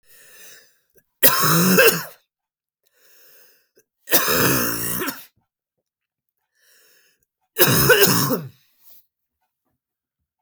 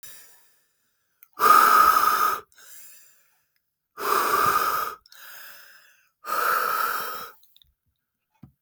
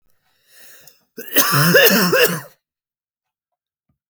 {
  "three_cough_length": "10.4 s",
  "three_cough_amplitude": 32768,
  "three_cough_signal_mean_std_ratio": 0.4,
  "exhalation_length": "8.6 s",
  "exhalation_amplitude": 21072,
  "exhalation_signal_mean_std_ratio": 0.46,
  "cough_length": "4.1 s",
  "cough_amplitude": 32768,
  "cough_signal_mean_std_ratio": 0.43,
  "survey_phase": "beta (2021-08-13 to 2022-03-07)",
  "age": "18-44",
  "gender": "Male",
  "wearing_mask": "No",
  "symptom_none": true,
  "symptom_onset": "13 days",
  "smoker_status": "Never smoked",
  "respiratory_condition_asthma": true,
  "respiratory_condition_other": false,
  "recruitment_source": "REACT",
  "submission_delay": "1 day",
  "covid_test_result": "Negative",
  "covid_test_method": "RT-qPCR",
  "influenza_a_test_result": "Unknown/Void",
  "influenza_b_test_result": "Unknown/Void"
}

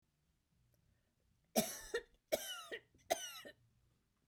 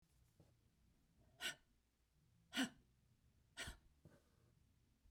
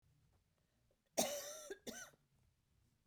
{
  "three_cough_length": "4.3 s",
  "three_cough_amplitude": 3353,
  "three_cough_signal_mean_std_ratio": 0.32,
  "exhalation_length": "5.1 s",
  "exhalation_amplitude": 1416,
  "exhalation_signal_mean_std_ratio": 0.28,
  "cough_length": "3.1 s",
  "cough_amplitude": 2399,
  "cough_signal_mean_std_ratio": 0.33,
  "survey_phase": "beta (2021-08-13 to 2022-03-07)",
  "age": "65+",
  "gender": "Female",
  "wearing_mask": "No",
  "symptom_cough_any": true,
  "symptom_new_continuous_cough": true,
  "symptom_runny_or_blocked_nose": true,
  "symptom_fatigue": true,
  "symptom_headache": true,
  "symptom_change_to_sense_of_smell_or_taste": true,
  "symptom_onset": "4 days",
  "smoker_status": "Never smoked",
  "respiratory_condition_asthma": true,
  "respiratory_condition_other": false,
  "recruitment_source": "Test and Trace",
  "submission_delay": "1 day",
  "covid_test_result": "Positive",
  "covid_test_method": "ePCR"
}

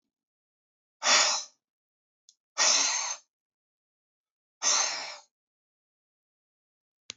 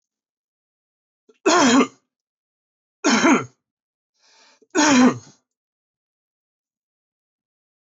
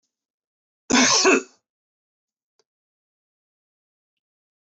{
  "exhalation_length": "7.2 s",
  "exhalation_amplitude": 12420,
  "exhalation_signal_mean_std_ratio": 0.34,
  "three_cough_length": "7.9 s",
  "three_cough_amplitude": 20488,
  "three_cough_signal_mean_std_ratio": 0.32,
  "cough_length": "4.7 s",
  "cough_amplitude": 18629,
  "cough_signal_mean_std_ratio": 0.26,
  "survey_phase": "beta (2021-08-13 to 2022-03-07)",
  "age": "65+",
  "gender": "Male",
  "wearing_mask": "No",
  "symptom_none": true,
  "smoker_status": "Never smoked",
  "respiratory_condition_asthma": false,
  "respiratory_condition_other": false,
  "recruitment_source": "REACT",
  "submission_delay": "1 day",
  "covid_test_result": "Negative",
  "covid_test_method": "RT-qPCR",
  "influenza_a_test_result": "Negative",
  "influenza_b_test_result": "Negative"
}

